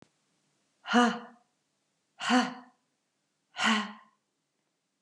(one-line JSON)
{"exhalation_length": "5.0 s", "exhalation_amplitude": 10534, "exhalation_signal_mean_std_ratio": 0.32, "survey_phase": "beta (2021-08-13 to 2022-03-07)", "age": "45-64", "gender": "Female", "wearing_mask": "No", "symptom_none": true, "smoker_status": "Never smoked", "respiratory_condition_asthma": false, "respiratory_condition_other": false, "recruitment_source": "REACT", "submission_delay": "1 day", "covid_test_result": "Negative", "covid_test_method": "RT-qPCR", "influenza_a_test_result": "Negative", "influenza_b_test_result": "Negative"}